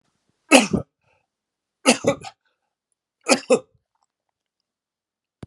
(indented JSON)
{
  "three_cough_length": "5.5 s",
  "three_cough_amplitude": 32768,
  "three_cough_signal_mean_std_ratio": 0.24,
  "survey_phase": "alpha (2021-03-01 to 2021-08-12)",
  "age": "65+",
  "gender": "Male",
  "wearing_mask": "No",
  "symptom_none": true,
  "smoker_status": "Never smoked",
  "respiratory_condition_asthma": false,
  "respiratory_condition_other": false,
  "recruitment_source": "REACT",
  "submission_delay": "2 days",
  "covid_test_result": "Negative",
  "covid_test_method": "RT-qPCR"
}